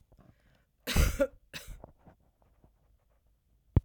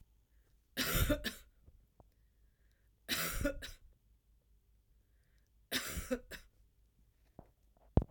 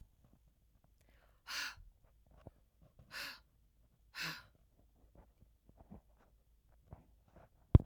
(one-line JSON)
{"cough_length": "3.8 s", "cough_amplitude": 8341, "cough_signal_mean_std_ratio": 0.26, "three_cough_length": "8.1 s", "three_cough_amplitude": 8525, "three_cough_signal_mean_std_ratio": 0.34, "exhalation_length": "7.9 s", "exhalation_amplitude": 9812, "exhalation_signal_mean_std_ratio": 0.14, "survey_phase": "beta (2021-08-13 to 2022-03-07)", "age": "65+", "gender": "Female", "wearing_mask": "No", "symptom_none": true, "smoker_status": "Never smoked", "respiratory_condition_asthma": false, "respiratory_condition_other": false, "recruitment_source": "Test and Trace", "submission_delay": "1 day", "covid_test_result": "Negative", "covid_test_method": "ePCR"}